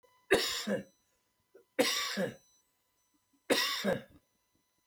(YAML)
three_cough_length: 4.9 s
three_cough_amplitude: 7360
three_cough_signal_mean_std_ratio: 0.43
survey_phase: beta (2021-08-13 to 2022-03-07)
age: 45-64
gender: Male
wearing_mask: 'No'
symptom_cough_any: true
symptom_new_continuous_cough: true
symptom_onset: 7 days
smoker_status: Ex-smoker
respiratory_condition_asthma: true
respiratory_condition_other: false
recruitment_source: REACT
submission_delay: 1 day
covid_test_result: Negative
covid_test_method: RT-qPCR